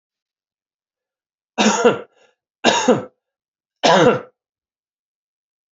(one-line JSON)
{"three_cough_length": "5.7 s", "three_cough_amplitude": 29709, "three_cough_signal_mean_std_ratio": 0.34, "survey_phase": "beta (2021-08-13 to 2022-03-07)", "age": "45-64", "gender": "Male", "wearing_mask": "No", "symptom_cough_any": true, "symptom_runny_or_blocked_nose": true, "symptom_fatigue": true, "symptom_fever_high_temperature": true, "symptom_headache": true, "symptom_change_to_sense_of_smell_or_taste": true, "symptom_loss_of_taste": true, "symptom_onset": "3 days", "smoker_status": "Never smoked", "respiratory_condition_asthma": false, "respiratory_condition_other": false, "recruitment_source": "Test and Trace", "submission_delay": "2 days", "covid_test_result": "Positive", "covid_test_method": "RT-qPCR", "covid_ct_value": 16.0, "covid_ct_gene": "ORF1ab gene", "covid_ct_mean": 16.6, "covid_viral_load": "3600000 copies/ml", "covid_viral_load_category": "High viral load (>1M copies/ml)"}